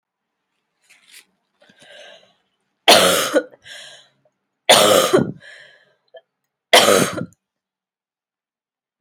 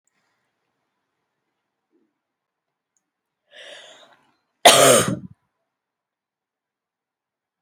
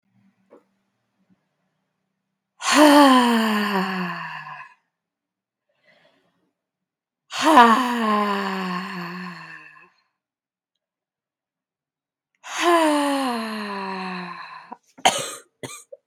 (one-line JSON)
{"three_cough_length": "9.0 s", "three_cough_amplitude": 32768, "three_cough_signal_mean_std_ratio": 0.32, "cough_length": "7.6 s", "cough_amplitude": 32768, "cough_signal_mean_std_ratio": 0.2, "exhalation_length": "16.1 s", "exhalation_amplitude": 32768, "exhalation_signal_mean_std_ratio": 0.41, "survey_phase": "beta (2021-08-13 to 2022-03-07)", "age": "18-44", "gender": "Female", "wearing_mask": "No", "symptom_cough_any": true, "symptom_new_continuous_cough": true, "symptom_runny_or_blocked_nose": true, "symptom_sore_throat": true, "symptom_fatigue": true, "symptom_headache": true, "symptom_other": true, "symptom_onset": "4 days", "smoker_status": "Never smoked", "respiratory_condition_asthma": false, "respiratory_condition_other": false, "recruitment_source": "Test and Trace", "submission_delay": "2 days", "covid_test_result": "Positive", "covid_test_method": "RT-qPCR", "covid_ct_value": 19.6, "covid_ct_gene": "N gene"}